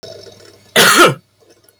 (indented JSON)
{
  "cough_length": "1.8 s",
  "cough_amplitude": 32768,
  "cough_signal_mean_std_ratio": 0.43,
  "survey_phase": "beta (2021-08-13 to 2022-03-07)",
  "age": "18-44",
  "gender": "Male",
  "wearing_mask": "No",
  "symptom_none": true,
  "smoker_status": "Current smoker (11 or more cigarettes per day)",
  "respiratory_condition_asthma": false,
  "respiratory_condition_other": false,
  "recruitment_source": "REACT",
  "submission_delay": "1 day",
  "covid_test_result": "Negative",
  "covid_test_method": "RT-qPCR",
  "influenza_a_test_result": "Negative",
  "influenza_b_test_result": "Negative"
}